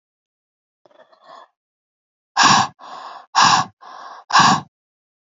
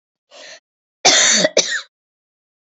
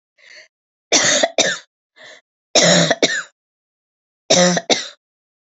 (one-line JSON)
{"exhalation_length": "5.2 s", "exhalation_amplitude": 32477, "exhalation_signal_mean_std_ratio": 0.35, "cough_length": "2.7 s", "cough_amplitude": 29932, "cough_signal_mean_std_ratio": 0.4, "three_cough_length": "5.5 s", "three_cough_amplitude": 31634, "three_cough_signal_mean_std_ratio": 0.43, "survey_phase": "beta (2021-08-13 to 2022-03-07)", "age": "45-64", "gender": "Female", "wearing_mask": "No", "symptom_cough_any": true, "symptom_runny_or_blocked_nose": true, "symptom_shortness_of_breath": true, "symptom_sore_throat": true, "symptom_fatigue": true, "symptom_headache": true, "symptom_onset": "2 days", "smoker_status": "Never smoked", "respiratory_condition_asthma": false, "respiratory_condition_other": false, "recruitment_source": "Test and Trace", "submission_delay": "1 day", "covid_test_result": "Negative", "covid_test_method": "RT-qPCR"}